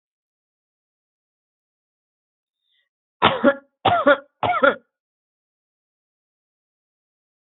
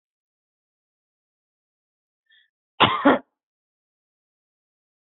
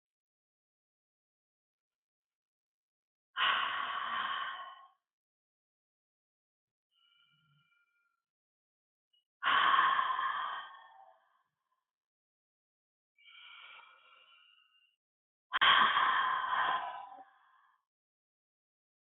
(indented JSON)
{
  "three_cough_length": "7.6 s",
  "three_cough_amplitude": 28069,
  "three_cough_signal_mean_std_ratio": 0.24,
  "cough_length": "5.1 s",
  "cough_amplitude": 26776,
  "cough_signal_mean_std_ratio": 0.18,
  "exhalation_length": "19.2 s",
  "exhalation_amplitude": 6714,
  "exhalation_signal_mean_std_ratio": 0.35,
  "survey_phase": "alpha (2021-03-01 to 2021-08-12)",
  "age": "18-44",
  "gender": "Female",
  "wearing_mask": "No",
  "symptom_none": true,
  "smoker_status": "Never smoked",
  "respiratory_condition_asthma": false,
  "respiratory_condition_other": false,
  "recruitment_source": "REACT",
  "submission_delay": "1 day",
  "covid_test_result": "Negative",
  "covid_test_method": "RT-qPCR"
}